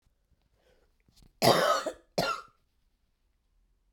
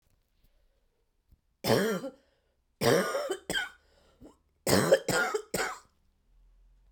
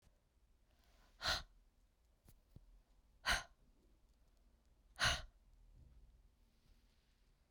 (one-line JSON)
{"cough_length": "3.9 s", "cough_amplitude": 15556, "cough_signal_mean_std_ratio": 0.31, "three_cough_length": "6.9 s", "three_cough_amplitude": 12076, "three_cough_signal_mean_std_ratio": 0.41, "exhalation_length": "7.5 s", "exhalation_amplitude": 2072, "exhalation_signal_mean_std_ratio": 0.27, "survey_phase": "beta (2021-08-13 to 2022-03-07)", "age": "45-64", "gender": "Female", "wearing_mask": "No", "symptom_cough_any": true, "symptom_runny_or_blocked_nose": true, "symptom_sore_throat": true, "symptom_fatigue": true, "symptom_onset": "2 days", "smoker_status": "Never smoked", "respiratory_condition_asthma": false, "respiratory_condition_other": false, "recruitment_source": "Test and Trace", "submission_delay": "2 days", "covid_test_result": "Positive", "covid_test_method": "RT-qPCR", "covid_ct_value": 18.5, "covid_ct_gene": "ORF1ab gene", "covid_ct_mean": 19.2, "covid_viral_load": "520000 copies/ml", "covid_viral_load_category": "Low viral load (10K-1M copies/ml)"}